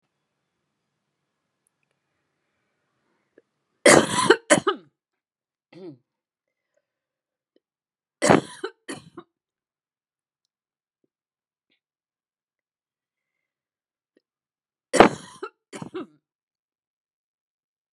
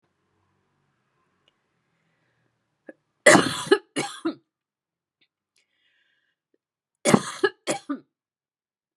{"three_cough_length": "17.9 s", "three_cough_amplitude": 32768, "three_cough_signal_mean_std_ratio": 0.17, "cough_length": "9.0 s", "cough_amplitude": 31816, "cough_signal_mean_std_ratio": 0.22, "survey_phase": "beta (2021-08-13 to 2022-03-07)", "age": "45-64", "gender": "Female", "wearing_mask": "No", "symptom_cough_any": true, "symptom_runny_or_blocked_nose": true, "symptom_sore_throat": true, "symptom_onset": "5 days", "smoker_status": "Ex-smoker", "respiratory_condition_asthma": false, "respiratory_condition_other": false, "recruitment_source": "REACT", "submission_delay": "-1 day", "covid_test_result": "Negative", "covid_test_method": "RT-qPCR", "influenza_a_test_result": "Unknown/Void", "influenza_b_test_result": "Unknown/Void"}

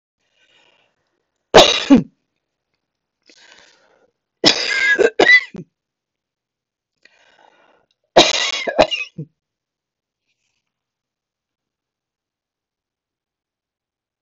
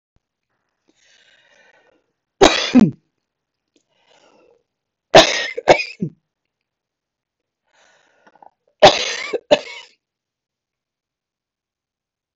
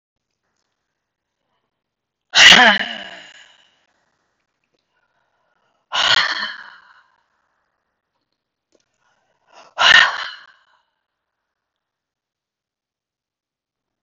{"three_cough_length": "14.2 s", "three_cough_amplitude": 32768, "three_cough_signal_mean_std_ratio": 0.26, "cough_length": "12.4 s", "cough_amplitude": 32768, "cough_signal_mean_std_ratio": 0.23, "exhalation_length": "14.0 s", "exhalation_amplitude": 32768, "exhalation_signal_mean_std_ratio": 0.23, "survey_phase": "beta (2021-08-13 to 2022-03-07)", "age": "65+", "gender": "Female", "wearing_mask": "No", "symptom_runny_or_blocked_nose": true, "symptom_onset": "13 days", "smoker_status": "Ex-smoker", "respiratory_condition_asthma": false, "respiratory_condition_other": false, "recruitment_source": "REACT", "submission_delay": "3 days", "covid_test_result": "Negative", "covid_test_method": "RT-qPCR", "influenza_a_test_result": "Negative", "influenza_b_test_result": "Negative"}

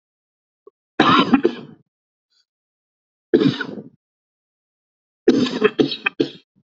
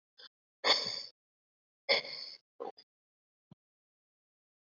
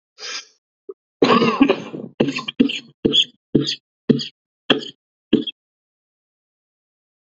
{"three_cough_length": "6.7 s", "three_cough_amplitude": 29079, "three_cough_signal_mean_std_ratio": 0.34, "exhalation_length": "4.7 s", "exhalation_amplitude": 7741, "exhalation_signal_mean_std_ratio": 0.27, "cough_length": "7.3 s", "cough_amplitude": 32050, "cough_signal_mean_std_ratio": 0.37, "survey_phase": "beta (2021-08-13 to 2022-03-07)", "age": "18-44", "gender": "Male", "wearing_mask": "No", "symptom_cough_any": true, "symptom_runny_or_blocked_nose": true, "symptom_shortness_of_breath": true, "symptom_fatigue": true, "symptom_headache": true, "smoker_status": "Ex-smoker", "respiratory_condition_asthma": false, "respiratory_condition_other": false, "recruitment_source": "Test and Trace", "submission_delay": "2 days", "covid_test_result": "Positive", "covid_test_method": "RT-qPCR"}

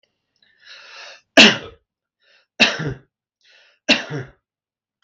{"three_cough_length": "5.0 s", "three_cough_amplitude": 32768, "three_cough_signal_mean_std_ratio": 0.26, "survey_phase": "beta (2021-08-13 to 2022-03-07)", "age": "45-64", "gender": "Male", "wearing_mask": "No", "symptom_none": true, "smoker_status": "Ex-smoker", "respiratory_condition_asthma": false, "respiratory_condition_other": false, "recruitment_source": "REACT", "submission_delay": "1 day", "covid_test_result": "Negative", "covid_test_method": "RT-qPCR"}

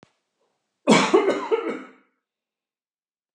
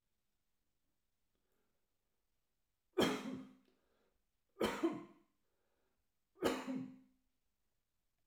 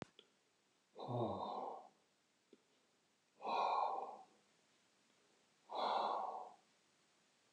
{"cough_length": "3.3 s", "cough_amplitude": 24062, "cough_signal_mean_std_ratio": 0.36, "three_cough_length": "8.3 s", "three_cough_amplitude": 2987, "three_cough_signal_mean_std_ratio": 0.3, "exhalation_length": "7.5 s", "exhalation_amplitude": 1470, "exhalation_signal_mean_std_ratio": 0.47, "survey_phase": "alpha (2021-03-01 to 2021-08-12)", "age": "65+", "gender": "Male", "wearing_mask": "No", "symptom_none": true, "smoker_status": "Ex-smoker", "respiratory_condition_asthma": false, "respiratory_condition_other": false, "recruitment_source": "REACT", "submission_delay": "2 days", "covid_test_result": "Negative", "covid_test_method": "RT-qPCR"}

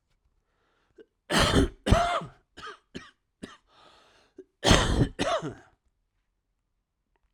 {"cough_length": "7.3 s", "cough_amplitude": 25167, "cough_signal_mean_std_ratio": 0.36, "survey_phase": "alpha (2021-03-01 to 2021-08-12)", "age": "45-64", "gender": "Male", "wearing_mask": "No", "symptom_cough_any": true, "symptom_change_to_sense_of_smell_or_taste": true, "symptom_loss_of_taste": true, "symptom_onset": "6 days", "smoker_status": "Ex-smoker", "respiratory_condition_asthma": true, "respiratory_condition_other": false, "recruitment_source": "Test and Trace", "submission_delay": "2 days", "covid_test_result": "Positive", "covid_test_method": "RT-qPCR", "covid_ct_value": 18.6, "covid_ct_gene": "ORF1ab gene"}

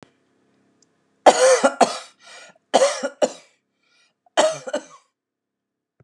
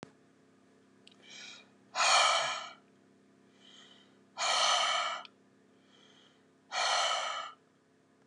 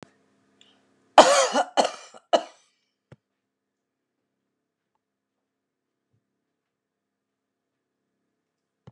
{"three_cough_length": "6.0 s", "three_cough_amplitude": 32768, "three_cough_signal_mean_std_ratio": 0.33, "exhalation_length": "8.3 s", "exhalation_amplitude": 7189, "exhalation_signal_mean_std_ratio": 0.45, "cough_length": "8.9 s", "cough_amplitude": 32768, "cough_signal_mean_std_ratio": 0.18, "survey_phase": "beta (2021-08-13 to 2022-03-07)", "age": "65+", "gender": "Female", "wearing_mask": "No", "symptom_none": true, "smoker_status": "Never smoked", "respiratory_condition_asthma": false, "respiratory_condition_other": false, "recruitment_source": "REACT", "submission_delay": "2 days", "covid_test_result": "Negative", "covid_test_method": "RT-qPCR", "influenza_a_test_result": "Unknown/Void", "influenza_b_test_result": "Unknown/Void"}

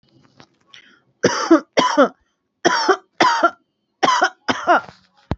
{"three_cough_length": "5.4 s", "three_cough_amplitude": 28807, "three_cough_signal_mean_std_ratio": 0.45, "survey_phase": "beta (2021-08-13 to 2022-03-07)", "age": "18-44", "gender": "Female", "wearing_mask": "No", "symptom_cough_any": true, "symptom_abdominal_pain": true, "symptom_headache": true, "symptom_onset": "12 days", "smoker_status": "Current smoker (1 to 10 cigarettes per day)", "respiratory_condition_asthma": true, "respiratory_condition_other": false, "recruitment_source": "REACT", "submission_delay": "2 days", "covid_test_result": "Negative", "covid_test_method": "RT-qPCR", "influenza_a_test_result": "Negative", "influenza_b_test_result": "Negative"}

